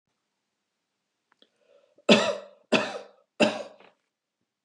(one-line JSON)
{"three_cough_length": "4.6 s", "three_cough_amplitude": 19834, "three_cough_signal_mean_std_ratio": 0.27, "survey_phase": "beta (2021-08-13 to 2022-03-07)", "age": "65+", "gender": "Female", "wearing_mask": "No", "symptom_none": true, "smoker_status": "Never smoked", "respiratory_condition_asthma": false, "respiratory_condition_other": false, "recruitment_source": "REACT", "submission_delay": "2 days", "covid_test_result": "Negative", "covid_test_method": "RT-qPCR", "influenza_a_test_result": "Negative", "influenza_b_test_result": "Negative"}